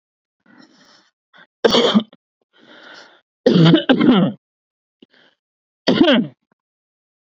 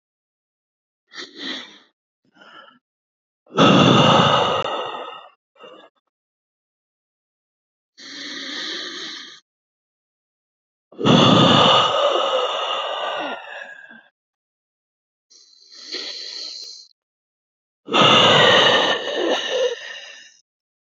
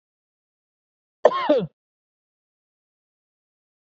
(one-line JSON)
{"three_cough_length": "7.3 s", "three_cough_amplitude": 29148, "three_cough_signal_mean_std_ratio": 0.38, "exhalation_length": "20.8 s", "exhalation_amplitude": 27159, "exhalation_signal_mean_std_ratio": 0.44, "cough_length": "3.9 s", "cough_amplitude": 26304, "cough_signal_mean_std_ratio": 0.21, "survey_phase": "beta (2021-08-13 to 2022-03-07)", "age": "18-44", "gender": "Male", "wearing_mask": "No", "symptom_cough_any": true, "symptom_sore_throat": true, "symptom_onset": "4 days", "smoker_status": "Never smoked", "respiratory_condition_asthma": false, "respiratory_condition_other": false, "recruitment_source": "REACT", "submission_delay": "2 days", "covid_test_result": "Negative", "covid_test_method": "RT-qPCR"}